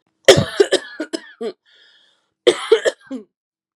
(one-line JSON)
{"cough_length": "3.8 s", "cough_amplitude": 32768, "cough_signal_mean_std_ratio": 0.33, "survey_phase": "beta (2021-08-13 to 2022-03-07)", "age": "18-44", "gender": "Female", "wearing_mask": "No", "symptom_none": true, "smoker_status": "Never smoked", "respiratory_condition_asthma": false, "respiratory_condition_other": false, "recruitment_source": "REACT", "submission_delay": "2 days", "covid_test_result": "Negative", "covid_test_method": "RT-qPCR"}